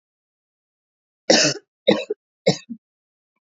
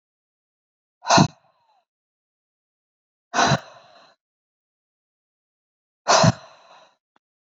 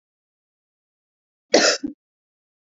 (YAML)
three_cough_length: 3.4 s
three_cough_amplitude: 27320
three_cough_signal_mean_std_ratio: 0.29
exhalation_length: 7.5 s
exhalation_amplitude: 25750
exhalation_signal_mean_std_ratio: 0.24
cough_length: 2.7 s
cough_amplitude: 27573
cough_signal_mean_std_ratio: 0.24
survey_phase: beta (2021-08-13 to 2022-03-07)
age: 18-44
gender: Female
wearing_mask: 'No'
symptom_runny_or_blocked_nose: true
symptom_sore_throat: true
symptom_fatigue: true
symptom_fever_high_temperature: true
symptom_headache: true
symptom_other: true
symptom_onset: 3 days
smoker_status: Current smoker (1 to 10 cigarettes per day)
respiratory_condition_asthma: false
respiratory_condition_other: false
recruitment_source: Test and Trace
submission_delay: 2 days
covid_test_result: Positive
covid_test_method: RT-qPCR
covid_ct_value: 26.0
covid_ct_gene: ORF1ab gene
covid_ct_mean: 26.2
covid_viral_load: 2500 copies/ml
covid_viral_load_category: Minimal viral load (< 10K copies/ml)